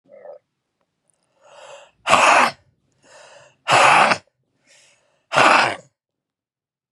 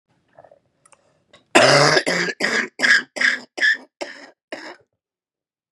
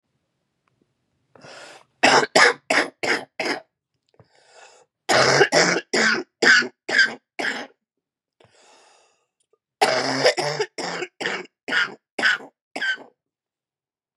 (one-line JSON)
{"exhalation_length": "6.9 s", "exhalation_amplitude": 32768, "exhalation_signal_mean_std_ratio": 0.36, "cough_length": "5.7 s", "cough_amplitude": 32768, "cough_signal_mean_std_ratio": 0.42, "three_cough_length": "14.2 s", "three_cough_amplitude": 30329, "three_cough_signal_mean_std_ratio": 0.42, "survey_phase": "beta (2021-08-13 to 2022-03-07)", "age": "45-64", "gender": "Female", "wearing_mask": "No", "symptom_cough_any": true, "symptom_runny_or_blocked_nose": true, "symptom_shortness_of_breath": true, "symptom_sore_throat": true, "symptom_fever_high_temperature": true, "symptom_onset": "1 day", "smoker_status": "Ex-smoker", "respiratory_condition_asthma": false, "respiratory_condition_other": true, "recruitment_source": "Test and Trace", "submission_delay": "0 days", "covid_test_result": "Negative", "covid_test_method": "RT-qPCR"}